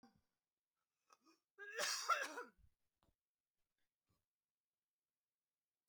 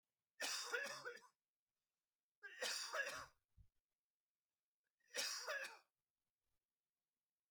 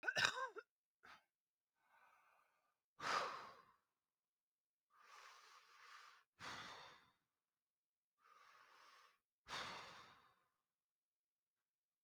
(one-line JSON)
{"cough_length": "5.9 s", "cough_amplitude": 1639, "cough_signal_mean_std_ratio": 0.26, "three_cough_length": "7.5 s", "three_cough_amplitude": 1187, "three_cough_signal_mean_std_ratio": 0.43, "exhalation_length": "12.0 s", "exhalation_amplitude": 4434, "exhalation_signal_mean_std_ratio": 0.3, "survey_phase": "beta (2021-08-13 to 2022-03-07)", "age": "45-64", "gender": "Female", "wearing_mask": "No", "symptom_cough_any": true, "smoker_status": "Never smoked", "respiratory_condition_asthma": false, "respiratory_condition_other": false, "recruitment_source": "REACT", "submission_delay": "3 days", "covid_test_result": "Negative", "covid_test_method": "RT-qPCR"}